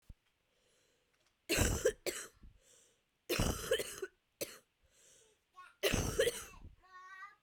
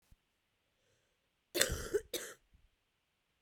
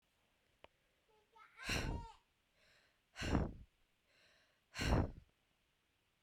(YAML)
three_cough_length: 7.4 s
three_cough_amplitude: 4595
three_cough_signal_mean_std_ratio: 0.41
cough_length: 3.4 s
cough_amplitude: 15324
cough_signal_mean_std_ratio: 0.28
exhalation_length: 6.2 s
exhalation_amplitude: 3471
exhalation_signal_mean_std_ratio: 0.34
survey_phase: beta (2021-08-13 to 2022-03-07)
age: 18-44
gender: Female
wearing_mask: 'No'
symptom_cough_any: true
symptom_runny_or_blocked_nose: true
symptom_shortness_of_breath: true
symptom_sore_throat: true
symptom_fatigue: true
symptom_headache: true
symptom_change_to_sense_of_smell_or_taste: true
symptom_onset: 7 days
smoker_status: Never smoked
respiratory_condition_asthma: false
respiratory_condition_other: false
recruitment_source: REACT
submission_delay: 2 days
covid_test_result: Negative
covid_test_method: RT-qPCR